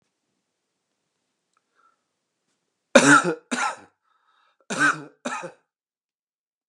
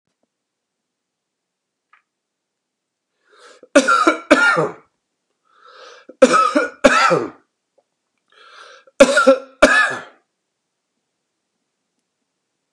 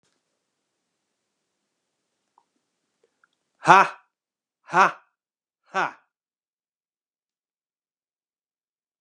{"cough_length": "6.7 s", "cough_amplitude": 32767, "cough_signal_mean_std_ratio": 0.26, "three_cough_length": "12.7 s", "three_cough_amplitude": 32768, "three_cough_signal_mean_std_ratio": 0.33, "exhalation_length": "9.0 s", "exhalation_amplitude": 32531, "exhalation_signal_mean_std_ratio": 0.16, "survey_phase": "beta (2021-08-13 to 2022-03-07)", "age": "45-64", "gender": "Male", "wearing_mask": "No", "symptom_runny_or_blocked_nose": true, "symptom_fatigue": true, "symptom_onset": "13 days", "smoker_status": "Ex-smoker", "respiratory_condition_asthma": false, "respiratory_condition_other": false, "recruitment_source": "REACT", "submission_delay": "1 day", "covid_test_result": "Negative", "covid_test_method": "RT-qPCR"}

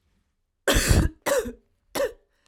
{"cough_length": "2.5 s", "cough_amplitude": 18499, "cough_signal_mean_std_ratio": 0.46, "survey_phase": "alpha (2021-03-01 to 2021-08-12)", "age": "18-44", "gender": "Female", "wearing_mask": "No", "symptom_cough_any": true, "symptom_fatigue": true, "symptom_headache": true, "symptom_change_to_sense_of_smell_or_taste": true, "smoker_status": "Never smoked", "respiratory_condition_asthma": false, "respiratory_condition_other": false, "recruitment_source": "Test and Trace", "submission_delay": "2 days", "covid_test_result": "Positive", "covid_test_method": "RT-qPCR"}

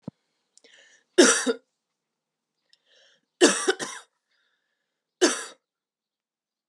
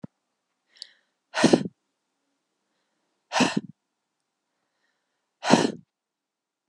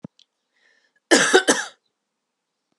{"three_cough_length": "6.7 s", "three_cough_amplitude": 22987, "three_cough_signal_mean_std_ratio": 0.26, "exhalation_length": "6.7 s", "exhalation_amplitude": 29299, "exhalation_signal_mean_std_ratio": 0.23, "cough_length": "2.8 s", "cough_amplitude": 31527, "cough_signal_mean_std_ratio": 0.3, "survey_phase": "beta (2021-08-13 to 2022-03-07)", "age": "18-44", "gender": "Female", "wearing_mask": "No", "symptom_cough_any": true, "symptom_runny_or_blocked_nose": true, "symptom_sore_throat": true, "symptom_onset": "3 days", "smoker_status": "Never smoked", "respiratory_condition_asthma": false, "respiratory_condition_other": false, "recruitment_source": "Test and Trace", "submission_delay": "1 day", "covid_test_result": "Positive", "covid_test_method": "RT-qPCR", "covid_ct_value": 26.3, "covid_ct_gene": "ORF1ab gene"}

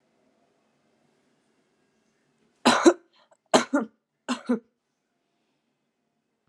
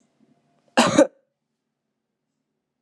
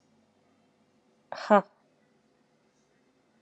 {"three_cough_length": "6.5 s", "three_cough_amplitude": 23597, "three_cough_signal_mean_std_ratio": 0.22, "cough_length": "2.8 s", "cough_amplitude": 26633, "cough_signal_mean_std_ratio": 0.23, "exhalation_length": "3.4 s", "exhalation_amplitude": 15079, "exhalation_signal_mean_std_ratio": 0.16, "survey_phase": "alpha (2021-03-01 to 2021-08-12)", "age": "18-44", "gender": "Female", "wearing_mask": "No", "symptom_headache": true, "symptom_onset": "2 days", "smoker_status": "Never smoked", "respiratory_condition_asthma": false, "respiratory_condition_other": false, "recruitment_source": "Test and Trace", "submission_delay": "1 day", "covid_test_result": "Positive", "covid_test_method": "RT-qPCR", "covid_ct_value": 23.3, "covid_ct_gene": "N gene"}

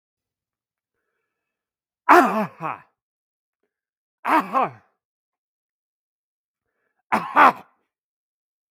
{"three_cough_length": "8.7 s", "three_cough_amplitude": 32768, "three_cough_signal_mean_std_ratio": 0.25, "survey_phase": "beta (2021-08-13 to 2022-03-07)", "age": "45-64", "gender": "Male", "wearing_mask": "No", "symptom_none": true, "smoker_status": "Ex-smoker", "respiratory_condition_asthma": false, "respiratory_condition_other": false, "recruitment_source": "REACT", "submission_delay": "1 day", "covid_test_result": "Negative", "covid_test_method": "RT-qPCR", "influenza_a_test_result": "Negative", "influenza_b_test_result": "Negative"}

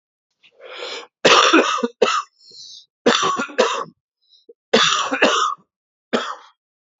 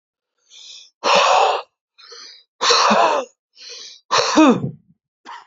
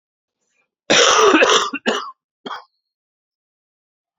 {"three_cough_length": "7.0 s", "three_cough_amplitude": 32768, "three_cough_signal_mean_std_ratio": 0.48, "exhalation_length": "5.5 s", "exhalation_amplitude": 31037, "exhalation_signal_mean_std_ratio": 0.5, "cough_length": "4.2 s", "cough_amplitude": 32767, "cough_signal_mean_std_ratio": 0.4, "survey_phase": "beta (2021-08-13 to 2022-03-07)", "age": "45-64", "gender": "Male", "wearing_mask": "No", "symptom_cough_any": true, "symptom_abdominal_pain": true, "symptom_fatigue": true, "symptom_headache": true, "symptom_onset": "3 days", "smoker_status": "Never smoked", "respiratory_condition_asthma": false, "respiratory_condition_other": false, "recruitment_source": "Test and Trace", "submission_delay": "2 days", "covid_test_result": "Positive", "covid_test_method": "RT-qPCR", "covid_ct_value": 15.5, "covid_ct_gene": "ORF1ab gene", "covid_ct_mean": 16.7, "covid_viral_load": "3400000 copies/ml", "covid_viral_load_category": "High viral load (>1M copies/ml)"}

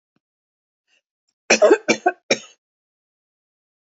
{"cough_length": "3.9 s", "cough_amplitude": 31580, "cough_signal_mean_std_ratio": 0.25, "survey_phase": "alpha (2021-03-01 to 2021-08-12)", "age": "45-64", "gender": "Female", "wearing_mask": "No", "symptom_none": true, "smoker_status": "Never smoked", "respiratory_condition_asthma": false, "respiratory_condition_other": false, "recruitment_source": "REACT", "submission_delay": "1 day", "covid_test_result": "Negative", "covid_test_method": "RT-qPCR"}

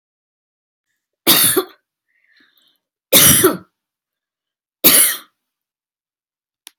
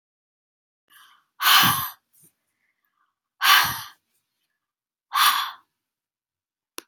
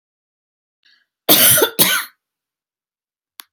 {"three_cough_length": "6.8 s", "three_cough_amplitude": 32768, "three_cough_signal_mean_std_ratio": 0.32, "exhalation_length": "6.9 s", "exhalation_amplitude": 28349, "exhalation_signal_mean_std_ratio": 0.31, "cough_length": "3.5 s", "cough_amplitude": 32768, "cough_signal_mean_std_ratio": 0.34, "survey_phase": "beta (2021-08-13 to 2022-03-07)", "age": "45-64", "gender": "Female", "wearing_mask": "No", "symptom_none": true, "smoker_status": "Never smoked", "respiratory_condition_asthma": false, "respiratory_condition_other": false, "recruitment_source": "Test and Trace", "submission_delay": "1 day", "covid_test_result": "Negative", "covid_test_method": "LFT"}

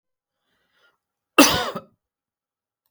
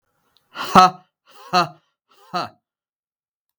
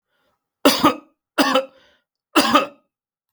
{"cough_length": "2.9 s", "cough_amplitude": 32768, "cough_signal_mean_std_ratio": 0.22, "exhalation_length": "3.6 s", "exhalation_amplitude": 32768, "exhalation_signal_mean_std_ratio": 0.26, "three_cough_length": "3.3 s", "three_cough_amplitude": 32768, "three_cough_signal_mean_std_ratio": 0.38, "survey_phase": "beta (2021-08-13 to 2022-03-07)", "age": "45-64", "gender": "Male", "wearing_mask": "No", "symptom_none": true, "smoker_status": "Never smoked", "respiratory_condition_asthma": false, "respiratory_condition_other": true, "recruitment_source": "REACT", "submission_delay": "1 day", "covid_test_result": "Negative", "covid_test_method": "RT-qPCR", "influenza_a_test_result": "Negative", "influenza_b_test_result": "Negative"}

